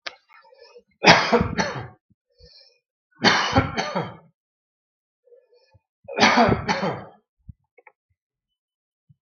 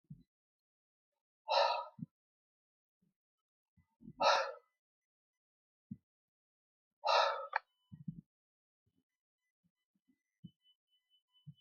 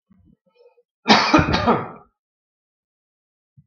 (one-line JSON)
{"three_cough_length": "9.2 s", "three_cough_amplitude": 32768, "three_cough_signal_mean_std_ratio": 0.35, "exhalation_length": "11.6 s", "exhalation_amplitude": 4859, "exhalation_signal_mean_std_ratio": 0.25, "cough_length": "3.7 s", "cough_amplitude": 32768, "cough_signal_mean_std_ratio": 0.34, "survey_phase": "beta (2021-08-13 to 2022-03-07)", "age": "45-64", "gender": "Male", "wearing_mask": "No", "symptom_none": true, "smoker_status": "Never smoked", "respiratory_condition_asthma": false, "respiratory_condition_other": false, "recruitment_source": "REACT", "submission_delay": "2 days", "covid_test_result": "Negative", "covid_test_method": "RT-qPCR"}